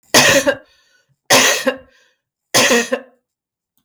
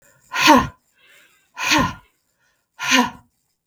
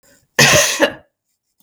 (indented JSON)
{
  "three_cough_length": "3.8 s",
  "three_cough_amplitude": 32768,
  "three_cough_signal_mean_std_ratio": 0.46,
  "exhalation_length": "3.7 s",
  "exhalation_amplitude": 32768,
  "exhalation_signal_mean_std_ratio": 0.38,
  "cough_length": "1.6 s",
  "cough_amplitude": 32768,
  "cough_signal_mean_std_ratio": 0.45,
  "survey_phase": "beta (2021-08-13 to 2022-03-07)",
  "age": "45-64",
  "gender": "Female",
  "wearing_mask": "No",
  "symptom_none": true,
  "smoker_status": "Never smoked",
  "respiratory_condition_asthma": false,
  "respiratory_condition_other": false,
  "recruitment_source": "REACT",
  "submission_delay": "1 day",
  "covid_test_result": "Negative",
  "covid_test_method": "RT-qPCR",
  "influenza_a_test_result": "Negative",
  "influenza_b_test_result": "Negative"
}